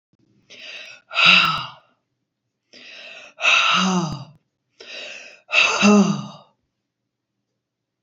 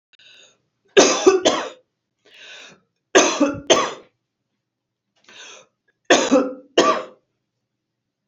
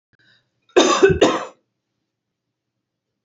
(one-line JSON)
{"exhalation_length": "8.0 s", "exhalation_amplitude": 28844, "exhalation_signal_mean_std_ratio": 0.42, "three_cough_length": "8.3 s", "three_cough_amplitude": 30091, "three_cough_signal_mean_std_ratio": 0.36, "cough_length": "3.2 s", "cough_amplitude": 29067, "cough_signal_mean_std_ratio": 0.33, "survey_phase": "beta (2021-08-13 to 2022-03-07)", "age": "45-64", "gender": "Female", "wearing_mask": "No", "symptom_none": true, "smoker_status": "Never smoked", "respiratory_condition_asthma": false, "respiratory_condition_other": false, "recruitment_source": "REACT", "submission_delay": "6 days", "covid_test_result": "Negative", "covid_test_method": "RT-qPCR", "influenza_a_test_result": "Negative", "influenza_b_test_result": "Negative"}